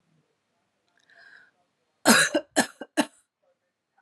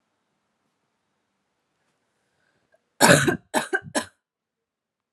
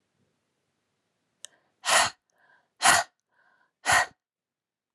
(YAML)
three_cough_length: 4.0 s
three_cough_amplitude: 25562
three_cough_signal_mean_std_ratio: 0.26
cough_length: 5.1 s
cough_amplitude: 32524
cough_signal_mean_std_ratio: 0.24
exhalation_length: 4.9 s
exhalation_amplitude: 20265
exhalation_signal_mean_std_ratio: 0.28
survey_phase: alpha (2021-03-01 to 2021-08-12)
age: 18-44
gender: Female
wearing_mask: 'No'
symptom_cough_any: true
symptom_fatigue: true
symptom_fever_high_temperature: true
symptom_headache: true
smoker_status: Never smoked
respiratory_condition_asthma: false
respiratory_condition_other: false
recruitment_source: Test and Trace
submission_delay: 2 days
covid_test_result: Positive
covid_test_method: RT-qPCR
covid_ct_value: 27.0
covid_ct_gene: ORF1ab gene
covid_ct_mean: 27.1
covid_viral_load: 1300 copies/ml
covid_viral_load_category: Minimal viral load (< 10K copies/ml)